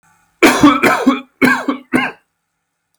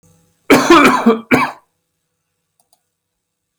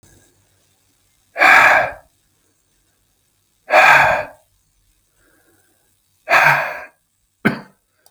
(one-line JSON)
{"three_cough_length": "3.0 s", "three_cough_amplitude": 32768, "three_cough_signal_mean_std_ratio": 0.5, "cough_length": "3.6 s", "cough_amplitude": 32768, "cough_signal_mean_std_ratio": 0.39, "exhalation_length": "8.1 s", "exhalation_amplitude": 32768, "exhalation_signal_mean_std_ratio": 0.35, "survey_phase": "beta (2021-08-13 to 2022-03-07)", "age": "18-44", "gender": "Male", "wearing_mask": "No", "symptom_cough_any": true, "smoker_status": "Never smoked", "respiratory_condition_asthma": false, "respiratory_condition_other": false, "recruitment_source": "REACT", "submission_delay": "2 days", "covid_test_result": "Negative", "covid_test_method": "RT-qPCR", "influenza_a_test_result": "Negative", "influenza_b_test_result": "Negative"}